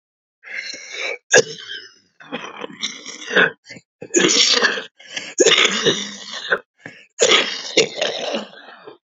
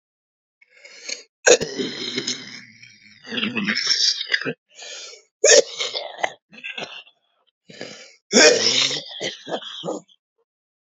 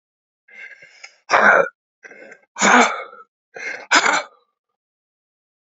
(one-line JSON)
{"cough_length": "9.0 s", "cough_amplitude": 32527, "cough_signal_mean_std_ratio": 0.49, "three_cough_length": "10.9 s", "three_cough_amplitude": 32767, "three_cough_signal_mean_std_ratio": 0.41, "exhalation_length": "5.7 s", "exhalation_amplitude": 29622, "exhalation_signal_mean_std_ratio": 0.36, "survey_phase": "beta (2021-08-13 to 2022-03-07)", "age": "65+", "gender": "Male", "wearing_mask": "No", "symptom_cough_any": true, "symptom_shortness_of_breath": true, "smoker_status": "Ex-smoker", "respiratory_condition_asthma": false, "respiratory_condition_other": true, "recruitment_source": "REACT", "submission_delay": "1 day", "covid_test_result": "Negative", "covid_test_method": "RT-qPCR"}